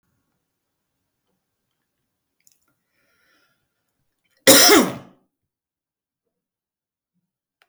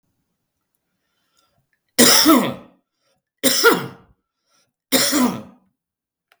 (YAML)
cough_length: 7.7 s
cough_amplitude: 32768
cough_signal_mean_std_ratio: 0.19
three_cough_length: 6.4 s
three_cough_amplitude: 32768
three_cough_signal_mean_std_ratio: 0.36
survey_phase: beta (2021-08-13 to 2022-03-07)
age: 65+
gender: Male
wearing_mask: 'No'
symptom_none: true
smoker_status: Ex-smoker
respiratory_condition_asthma: false
respiratory_condition_other: false
recruitment_source: REACT
submission_delay: 4 days
covid_test_result: Negative
covid_test_method: RT-qPCR
influenza_a_test_result: Negative
influenza_b_test_result: Negative